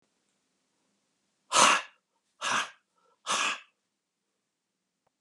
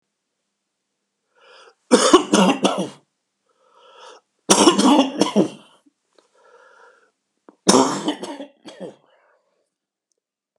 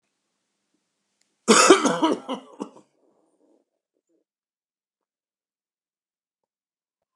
exhalation_length: 5.2 s
exhalation_amplitude: 16419
exhalation_signal_mean_std_ratio: 0.29
three_cough_length: 10.6 s
three_cough_amplitude: 32768
three_cough_signal_mean_std_ratio: 0.34
cough_length: 7.2 s
cough_amplitude: 31081
cough_signal_mean_std_ratio: 0.23
survey_phase: beta (2021-08-13 to 2022-03-07)
age: 65+
gender: Male
wearing_mask: 'No'
symptom_cough_any: true
symptom_sore_throat: true
smoker_status: Never smoked
respiratory_condition_asthma: false
respiratory_condition_other: false
recruitment_source: REACT
submission_delay: 3 days
covid_test_result: Positive
covid_test_method: RT-qPCR
covid_ct_value: 22.0
covid_ct_gene: E gene
influenza_a_test_result: Negative
influenza_b_test_result: Negative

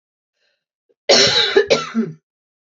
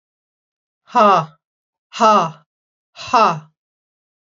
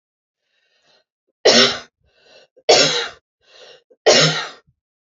cough_length: 2.7 s
cough_amplitude: 30604
cough_signal_mean_std_ratio: 0.44
exhalation_length: 4.3 s
exhalation_amplitude: 28551
exhalation_signal_mean_std_ratio: 0.36
three_cough_length: 5.1 s
three_cough_amplitude: 32734
three_cough_signal_mean_std_ratio: 0.36
survey_phase: alpha (2021-03-01 to 2021-08-12)
age: 45-64
gender: Female
wearing_mask: 'No'
symptom_none: true
smoker_status: Never smoked
respiratory_condition_asthma: false
respiratory_condition_other: false
recruitment_source: REACT
submission_delay: 1 day
covid_test_result: Negative
covid_test_method: RT-qPCR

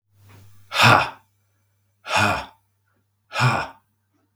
exhalation_length: 4.4 s
exhalation_amplitude: 32767
exhalation_signal_mean_std_ratio: 0.37
survey_phase: beta (2021-08-13 to 2022-03-07)
age: 45-64
gender: Male
wearing_mask: 'No'
symptom_cough_any: true
symptom_fatigue: true
symptom_onset: 3 days
smoker_status: Never smoked
respiratory_condition_asthma: true
respiratory_condition_other: false
recruitment_source: Test and Trace
submission_delay: 1 day
covid_test_result: Positive
covid_test_method: RT-qPCR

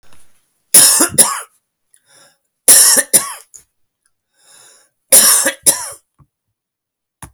three_cough_length: 7.3 s
three_cough_amplitude: 32768
three_cough_signal_mean_std_ratio: 0.37
survey_phase: beta (2021-08-13 to 2022-03-07)
age: 45-64
gender: Male
wearing_mask: 'No'
symptom_none: true
smoker_status: Never smoked
respiratory_condition_asthma: false
respiratory_condition_other: false
recruitment_source: REACT
submission_delay: 6 days
covid_test_result: Negative
covid_test_method: RT-qPCR
influenza_a_test_result: Negative
influenza_b_test_result: Negative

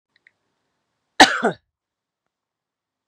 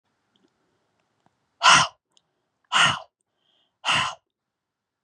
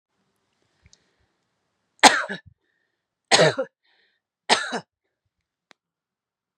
cough_length: 3.1 s
cough_amplitude: 32768
cough_signal_mean_std_ratio: 0.18
exhalation_length: 5.0 s
exhalation_amplitude: 27759
exhalation_signal_mean_std_ratio: 0.28
three_cough_length: 6.6 s
three_cough_amplitude: 32768
three_cough_signal_mean_std_ratio: 0.22
survey_phase: beta (2021-08-13 to 2022-03-07)
age: 45-64
gender: Female
wearing_mask: 'No'
symptom_none: true
smoker_status: Ex-smoker
respiratory_condition_asthma: false
respiratory_condition_other: false
recruitment_source: REACT
submission_delay: 1 day
covid_test_result: Negative
covid_test_method: RT-qPCR
influenza_a_test_result: Negative
influenza_b_test_result: Negative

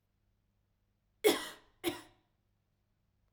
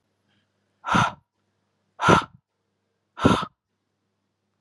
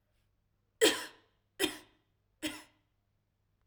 cough_length: 3.3 s
cough_amplitude: 6836
cough_signal_mean_std_ratio: 0.22
exhalation_length: 4.6 s
exhalation_amplitude: 31732
exhalation_signal_mean_std_ratio: 0.28
three_cough_length: 3.7 s
three_cough_amplitude: 8663
three_cough_signal_mean_std_ratio: 0.25
survey_phase: alpha (2021-03-01 to 2021-08-12)
age: 18-44
gender: Female
wearing_mask: 'No'
symptom_none: true
smoker_status: Never smoked
respiratory_condition_asthma: false
respiratory_condition_other: false
recruitment_source: REACT
submission_delay: 2 days
covid_test_result: Negative
covid_test_method: RT-qPCR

